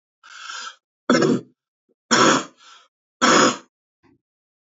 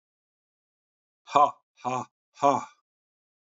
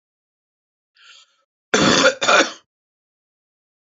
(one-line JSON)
{"three_cough_length": "4.6 s", "three_cough_amplitude": 26348, "three_cough_signal_mean_std_ratio": 0.39, "exhalation_length": "3.5 s", "exhalation_amplitude": 18573, "exhalation_signal_mean_std_ratio": 0.26, "cough_length": "3.9 s", "cough_amplitude": 29196, "cough_signal_mean_std_ratio": 0.32, "survey_phase": "beta (2021-08-13 to 2022-03-07)", "age": "45-64", "gender": "Male", "wearing_mask": "No", "symptom_runny_or_blocked_nose": true, "symptom_sore_throat": true, "symptom_fatigue": true, "symptom_onset": "12 days", "smoker_status": "Never smoked", "respiratory_condition_asthma": false, "respiratory_condition_other": false, "recruitment_source": "REACT", "submission_delay": "1 day", "covid_test_result": "Positive", "covid_test_method": "RT-qPCR", "covid_ct_value": 28.9, "covid_ct_gene": "N gene", "influenza_a_test_result": "Negative", "influenza_b_test_result": "Negative"}